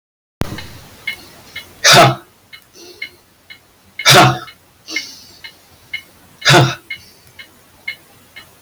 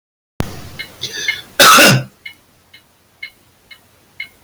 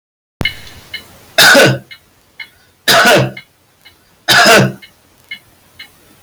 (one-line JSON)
{"exhalation_length": "8.6 s", "exhalation_amplitude": 32768, "exhalation_signal_mean_std_ratio": 0.34, "cough_length": "4.4 s", "cough_amplitude": 32768, "cough_signal_mean_std_ratio": 0.37, "three_cough_length": "6.2 s", "three_cough_amplitude": 32766, "three_cough_signal_mean_std_ratio": 0.46, "survey_phase": "beta (2021-08-13 to 2022-03-07)", "age": "45-64", "gender": "Male", "wearing_mask": "No", "symptom_none": true, "smoker_status": "Current smoker (1 to 10 cigarettes per day)", "respiratory_condition_asthma": false, "respiratory_condition_other": false, "recruitment_source": "REACT", "submission_delay": "3 days", "covid_test_result": "Negative", "covid_test_method": "RT-qPCR", "influenza_a_test_result": "Negative", "influenza_b_test_result": "Negative"}